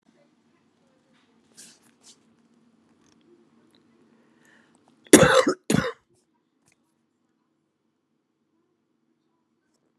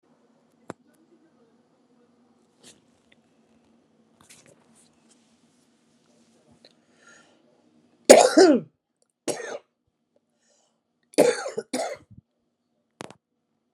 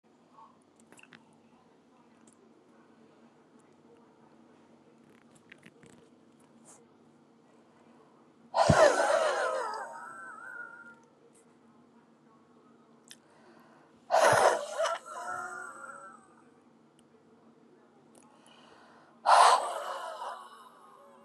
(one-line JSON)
{"cough_length": "10.0 s", "cough_amplitude": 32768, "cough_signal_mean_std_ratio": 0.17, "three_cough_length": "13.7 s", "three_cough_amplitude": 32768, "three_cough_signal_mean_std_ratio": 0.19, "exhalation_length": "21.2 s", "exhalation_amplitude": 14120, "exhalation_signal_mean_std_ratio": 0.32, "survey_phase": "beta (2021-08-13 to 2022-03-07)", "age": "45-64", "gender": "Female", "wearing_mask": "No", "symptom_shortness_of_breath": true, "symptom_fatigue": true, "smoker_status": "Current smoker (1 to 10 cigarettes per day)", "respiratory_condition_asthma": true, "respiratory_condition_other": false, "recruitment_source": "REACT", "submission_delay": "1 day", "covid_test_result": "Negative", "covid_test_method": "RT-qPCR"}